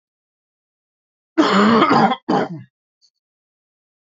{"cough_length": "4.0 s", "cough_amplitude": 26610, "cough_signal_mean_std_ratio": 0.42, "survey_phase": "beta (2021-08-13 to 2022-03-07)", "age": "18-44", "gender": "Male", "wearing_mask": "No", "symptom_cough_any": true, "symptom_sore_throat": true, "symptom_onset": "2 days", "smoker_status": "Never smoked", "respiratory_condition_asthma": false, "respiratory_condition_other": false, "recruitment_source": "Test and Trace", "submission_delay": "1 day", "covid_test_result": "Positive", "covid_test_method": "RT-qPCR", "covid_ct_value": 20.7, "covid_ct_gene": "ORF1ab gene", "covid_ct_mean": 21.0, "covid_viral_load": "130000 copies/ml", "covid_viral_load_category": "Low viral load (10K-1M copies/ml)"}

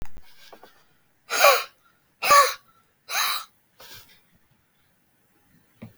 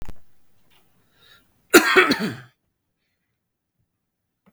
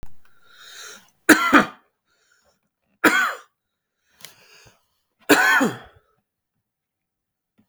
{"exhalation_length": "6.0 s", "exhalation_amplitude": 25595, "exhalation_signal_mean_std_ratio": 0.32, "cough_length": "4.5 s", "cough_amplitude": 32768, "cough_signal_mean_std_ratio": 0.27, "three_cough_length": "7.7 s", "three_cough_amplitude": 32768, "three_cough_signal_mean_std_ratio": 0.3, "survey_phase": "beta (2021-08-13 to 2022-03-07)", "age": "18-44", "gender": "Male", "wearing_mask": "No", "symptom_none": true, "symptom_onset": "12 days", "smoker_status": "Never smoked", "respiratory_condition_asthma": false, "respiratory_condition_other": false, "recruitment_source": "REACT", "submission_delay": "3 days", "covid_test_result": "Negative", "covid_test_method": "RT-qPCR", "influenza_a_test_result": "Negative", "influenza_b_test_result": "Negative"}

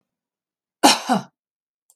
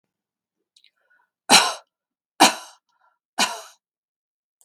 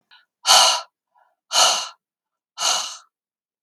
{"cough_length": "2.0 s", "cough_amplitude": 32768, "cough_signal_mean_std_ratio": 0.28, "three_cough_length": "4.6 s", "three_cough_amplitude": 32767, "three_cough_signal_mean_std_ratio": 0.23, "exhalation_length": "3.6 s", "exhalation_amplitude": 32768, "exhalation_signal_mean_std_ratio": 0.39, "survey_phase": "beta (2021-08-13 to 2022-03-07)", "age": "45-64", "gender": "Female", "wearing_mask": "No", "symptom_none": true, "smoker_status": "Ex-smoker", "respiratory_condition_asthma": false, "respiratory_condition_other": false, "recruitment_source": "REACT", "submission_delay": "3 days", "covid_test_result": "Negative", "covid_test_method": "RT-qPCR", "influenza_a_test_result": "Negative", "influenza_b_test_result": "Negative"}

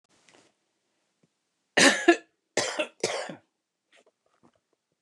{"three_cough_length": "5.0 s", "three_cough_amplitude": 20122, "three_cough_signal_mean_std_ratio": 0.27, "survey_phase": "beta (2021-08-13 to 2022-03-07)", "age": "65+", "gender": "Female", "wearing_mask": "No", "symptom_none": true, "smoker_status": "Ex-smoker", "respiratory_condition_asthma": false, "respiratory_condition_other": false, "recruitment_source": "REACT", "submission_delay": "2 days", "covid_test_result": "Negative", "covid_test_method": "RT-qPCR", "influenza_a_test_result": "Negative", "influenza_b_test_result": "Negative"}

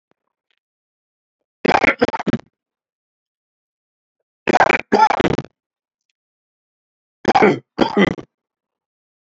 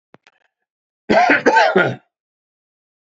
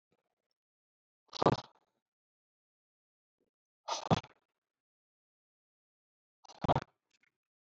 {"three_cough_length": "9.2 s", "three_cough_amplitude": 32768, "three_cough_signal_mean_std_ratio": 0.31, "cough_length": "3.2 s", "cough_amplitude": 29157, "cough_signal_mean_std_ratio": 0.41, "exhalation_length": "7.7 s", "exhalation_amplitude": 9737, "exhalation_signal_mean_std_ratio": 0.16, "survey_phase": "alpha (2021-03-01 to 2021-08-12)", "age": "45-64", "gender": "Male", "wearing_mask": "No", "symptom_none": true, "smoker_status": "Never smoked", "respiratory_condition_asthma": true, "respiratory_condition_other": false, "recruitment_source": "REACT", "submission_delay": "4 days", "covid_test_result": "Negative", "covid_test_method": "RT-qPCR"}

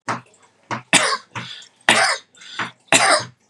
{"three_cough_length": "3.5 s", "three_cough_amplitude": 32768, "three_cough_signal_mean_std_ratio": 0.46, "survey_phase": "beta (2021-08-13 to 2022-03-07)", "age": "18-44", "gender": "Male", "wearing_mask": "No", "symptom_none": true, "smoker_status": "Never smoked", "respiratory_condition_asthma": true, "respiratory_condition_other": false, "recruitment_source": "REACT", "submission_delay": "0 days", "covid_test_result": "Negative", "covid_test_method": "RT-qPCR", "influenza_a_test_result": "Unknown/Void", "influenza_b_test_result": "Unknown/Void"}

